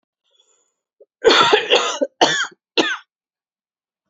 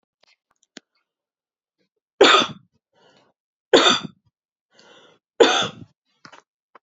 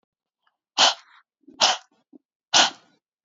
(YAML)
cough_length: 4.1 s
cough_amplitude: 30153
cough_signal_mean_std_ratio: 0.41
three_cough_length: 6.8 s
three_cough_amplitude: 31985
three_cough_signal_mean_std_ratio: 0.26
exhalation_length: 3.2 s
exhalation_amplitude: 29231
exhalation_signal_mean_std_ratio: 0.3
survey_phase: alpha (2021-03-01 to 2021-08-12)
age: 45-64
gender: Female
wearing_mask: 'No'
symptom_none: true
symptom_onset: 12 days
smoker_status: Never smoked
respiratory_condition_asthma: false
respiratory_condition_other: false
recruitment_source: REACT
submission_delay: 1 day
covid_test_result: Negative
covid_test_method: RT-qPCR